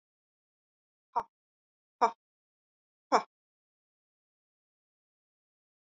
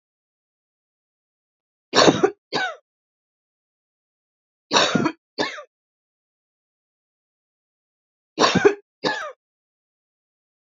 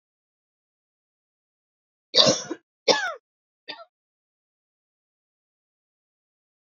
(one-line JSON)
{"exhalation_length": "6.0 s", "exhalation_amplitude": 10320, "exhalation_signal_mean_std_ratio": 0.13, "three_cough_length": "10.8 s", "three_cough_amplitude": 30762, "three_cough_signal_mean_std_ratio": 0.27, "cough_length": "6.7 s", "cough_amplitude": 32768, "cough_signal_mean_std_ratio": 0.2, "survey_phase": "beta (2021-08-13 to 2022-03-07)", "age": "45-64", "gender": "Female", "wearing_mask": "No", "symptom_fatigue": true, "smoker_status": "Never smoked", "respiratory_condition_asthma": false, "respiratory_condition_other": false, "recruitment_source": "Test and Trace", "submission_delay": "3 days", "covid_test_result": "Negative", "covid_test_method": "ePCR"}